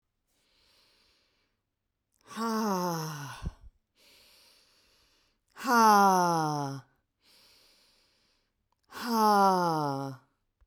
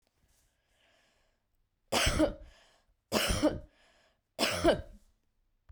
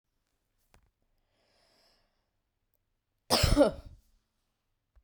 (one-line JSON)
{"exhalation_length": "10.7 s", "exhalation_amplitude": 10575, "exhalation_signal_mean_std_ratio": 0.41, "three_cough_length": "5.7 s", "three_cough_amplitude": 8494, "three_cough_signal_mean_std_ratio": 0.37, "cough_length": "5.0 s", "cough_amplitude": 10182, "cough_signal_mean_std_ratio": 0.22, "survey_phase": "beta (2021-08-13 to 2022-03-07)", "age": "45-64", "gender": "Female", "wearing_mask": "No", "symptom_none": true, "smoker_status": "Ex-smoker", "respiratory_condition_asthma": false, "respiratory_condition_other": false, "recruitment_source": "REACT", "submission_delay": "1 day", "covid_test_result": "Negative", "covid_test_method": "RT-qPCR"}